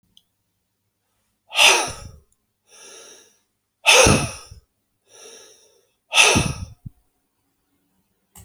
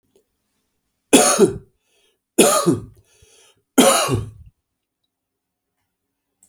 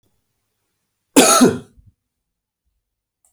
exhalation_length: 8.4 s
exhalation_amplitude: 32767
exhalation_signal_mean_std_ratio: 0.3
three_cough_length: 6.5 s
three_cough_amplitude: 32768
three_cough_signal_mean_std_ratio: 0.34
cough_length: 3.3 s
cough_amplitude: 32767
cough_signal_mean_std_ratio: 0.28
survey_phase: alpha (2021-03-01 to 2021-08-12)
age: 65+
gender: Male
wearing_mask: 'No'
symptom_cough_any: true
smoker_status: Ex-smoker
respiratory_condition_asthma: false
respiratory_condition_other: false
recruitment_source: REACT
submission_delay: 2 days
covid_test_result: Negative
covid_test_method: RT-qPCR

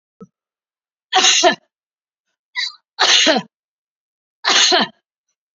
three_cough_length: 5.5 s
three_cough_amplitude: 32768
three_cough_signal_mean_std_ratio: 0.4
survey_phase: beta (2021-08-13 to 2022-03-07)
age: 65+
gender: Female
wearing_mask: 'No'
symptom_none: true
smoker_status: Never smoked
respiratory_condition_asthma: true
respiratory_condition_other: false
recruitment_source: REACT
submission_delay: 1 day
covid_test_result: Negative
covid_test_method: RT-qPCR
influenza_a_test_result: Negative
influenza_b_test_result: Negative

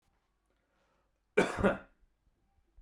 cough_length: 2.8 s
cough_amplitude: 9066
cough_signal_mean_std_ratio: 0.26
survey_phase: beta (2021-08-13 to 2022-03-07)
age: 18-44
gender: Male
wearing_mask: 'No'
symptom_sore_throat: true
smoker_status: Never smoked
respiratory_condition_asthma: false
respiratory_condition_other: false
recruitment_source: REACT
submission_delay: 1 day
covid_test_result: Negative
covid_test_method: RT-qPCR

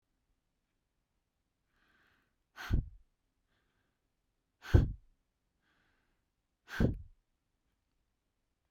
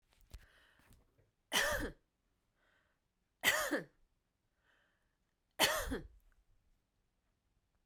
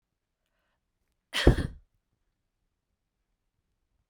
exhalation_length: 8.7 s
exhalation_amplitude: 7375
exhalation_signal_mean_std_ratio: 0.19
three_cough_length: 7.9 s
three_cough_amplitude: 5314
three_cough_signal_mean_std_ratio: 0.31
cough_length: 4.1 s
cough_amplitude: 20853
cough_signal_mean_std_ratio: 0.17
survey_phase: beta (2021-08-13 to 2022-03-07)
age: 18-44
gender: Female
wearing_mask: 'No'
symptom_runny_or_blocked_nose: true
symptom_sore_throat: true
symptom_fatigue: true
symptom_headache: true
symptom_onset: 13 days
smoker_status: Never smoked
respiratory_condition_asthma: false
respiratory_condition_other: false
recruitment_source: REACT
submission_delay: 2 days
covid_test_result: Negative
covid_test_method: RT-qPCR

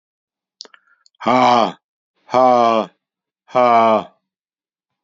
exhalation_length: 5.0 s
exhalation_amplitude: 28981
exhalation_signal_mean_std_ratio: 0.42
survey_phase: beta (2021-08-13 to 2022-03-07)
age: 65+
gender: Male
wearing_mask: 'No'
symptom_none: true
smoker_status: Never smoked
respiratory_condition_asthma: false
respiratory_condition_other: false
recruitment_source: REACT
submission_delay: 1 day
covid_test_result: Negative
covid_test_method: RT-qPCR
influenza_a_test_result: Negative
influenza_b_test_result: Negative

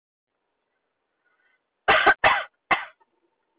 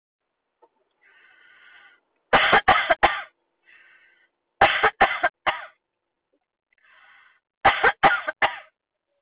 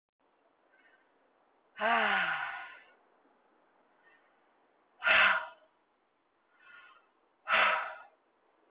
cough_length: 3.6 s
cough_amplitude: 18009
cough_signal_mean_std_ratio: 0.3
three_cough_length: 9.2 s
three_cough_amplitude: 22763
three_cough_signal_mean_std_ratio: 0.34
exhalation_length: 8.7 s
exhalation_amplitude: 6690
exhalation_signal_mean_std_ratio: 0.35
survey_phase: beta (2021-08-13 to 2022-03-07)
age: 45-64
gender: Female
wearing_mask: 'No'
symptom_none: true
smoker_status: Never smoked
respiratory_condition_asthma: false
respiratory_condition_other: false
recruitment_source: REACT
submission_delay: 0 days
covid_test_result: Negative
covid_test_method: RT-qPCR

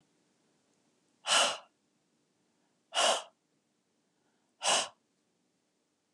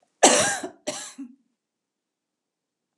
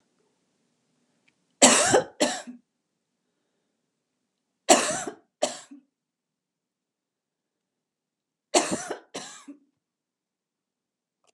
exhalation_length: 6.1 s
exhalation_amplitude: 8745
exhalation_signal_mean_std_ratio: 0.29
cough_length: 3.0 s
cough_amplitude: 31259
cough_signal_mean_std_ratio: 0.3
three_cough_length: 11.3 s
three_cough_amplitude: 32767
three_cough_signal_mean_std_ratio: 0.24
survey_phase: beta (2021-08-13 to 2022-03-07)
age: 65+
gender: Female
wearing_mask: 'No'
symptom_none: true
smoker_status: Never smoked
respiratory_condition_asthma: false
respiratory_condition_other: false
recruitment_source: REACT
submission_delay: 2 days
covid_test_result: Negative
covid_test_method: RT-qPCR
influenza_a_test_result: Negative
influenza_b_test_result: Negative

